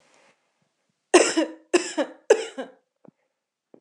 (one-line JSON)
{"cough_length": "3.8 s", "cough_amplitude": 25752, "cough_signal_mean_std_ratio": 0.3, "survey_phase": "alpha (2021-03-01 to 2021-08-12)", "age": "18-44", "gender": "Female", "wearing_mask": "No", "symptom_none": true, "smoker_status": "Never smoked", "respiratory_condition_asthma": false, "respiratory_condition_other": false, "recruitment_source": "REACT", "submission_delay": "1 day", "covid_test_result": "Negative", "covid_test_method": "RT-qPCR"}